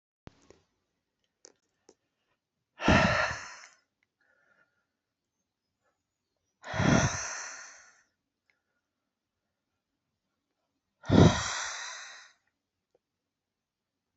exhalation_length: 14.2 s
exhalation_amplitude: 15147
exhalation_signal_mean_std_ratio: 0.26
survey_phase: alpha (2021-03-01 to 2021-08-12)
age: 65+
gender: Male
wearing_mask: 'No'
symptom_headache: true
symptom_change_to_sense_of_smell_or_taste: true
symptom_loss_of_taste: true
smoker_status: Never smoked
respiratory_condition_asthma: false
respiratory_condition_other: false
recruitment_source: Test and Trace
submission_delay: 2 days
covid_test_result: Positive
covid_test_method: RT-qPCR
covid_ct_value: 21.5
covid_ct_gene: ORF1ab gene
covid_ct_mean: 22.1
covid_viral_load: 56000 copies/ml
covid_viral_load_category: Low viral load (10K-1M copies/ml)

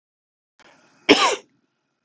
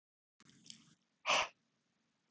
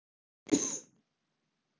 cough_length: 2.0 s
cough_amplitude: 32766
cough_signal_mean_std_ratio: 0.27
exhalation_length: 2.3 s
exhalation_amplitude: 3402
exhalation_signal_mean_std_ratio: 0.25
three_cough_length: 1.8 s
three_cough_amplitude: 7519
three_cough_signal_mean_std_ratio: 0.26
survey_phase: alpha (2021-03-01 to 2021-08-12)
age: 18-44
gender: Male
wearing_mask: 'No'
symptom_cough_any: true
symptom_new_continuous_cough: true
symptom_shortness_of_breath: true
symptom_fever_high_temperature: true
symptom_headache: true
symptom_change_to_sense_of_smell_or_taste: true
symptom_loss_of_taste: true
symptom_onset: 3 days
smoker_status: Never smoked
respiratory_condition_asthma: false
respiratory_condition_other: false
recruitment_source: Test and Trace
submission_delay: 2 days
covid_test_result: Positive
covid_test_method: RT-qPCR
covid_ct_value: 21.2
covid_ct_gene: ORF1ab gene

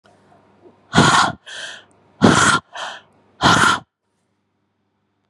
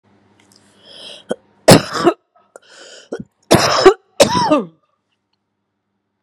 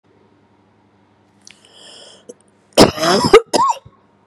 exhalation_length: 5.3 s
exhalation_amplitude: 32768
exhalation_signal_mean_std_ratio: 0.4
three_cough_length: 6.2 s
three_cough_amplitude: 32768
three_cough_signal_mean_std_ratio: 0.33
cough_length: 4.3 s
cough_amplitude: 32768
cough_signal_mean_std_ratio: 0.32
survey_phase: beta (2021-08-13 to 2022-03-07)
age: 45-64
gender: Female
wearing_mask: 'No'
symptom_runny_or_blocked_nose: true
symptom_fatigue: true
symptom_change_to_sense_of_smell_or_taste: true
symptom_onset: 3 days
smoker_status: Ex-smoker
respiratory_condition_asthma: false
respiratory_condition_other: false
recruitment_source: Test and Trace
submission_delay: 2 days
covid_test_result: Positive
covid_test_method: RT-qPCR
covid_ct_value: 18.4
covid_ct_gene: ORF1ab gene
covid_ct_mean: 18.8
covid_viral_load: 660000 copies/ml
covid_viral_load_category: Low viral load (10K-1M copies/ml)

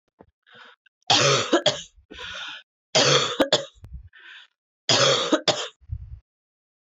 three_cough_length: 6.8 s
three_cough_amplitude: 20970
three_cough_signal_mean_std_ratio: 0.45
survey_phase: beta (2021-08-13 to 2022-03-07)
age: 18-44
gender: Female
wearing_mask: 'No'
symptom_cough_any: true
symptom_runny_or_blocked_nose: true
symptom_sore_throat: true
symptom_fatigue: true
symptom_headache: true
symptom_change_to_sense_of_smell_or_taste: true
symptom_loss_of_taste: true
symptom_onset: 12 days
smoker_status: Never smoked
respiratory_condition_asthma: false
respiratory_condition_other: false
recruitment_source: REACT
submission_delay: 2 days
covid_test_result: Negative
covid_test_method: RT-qPCR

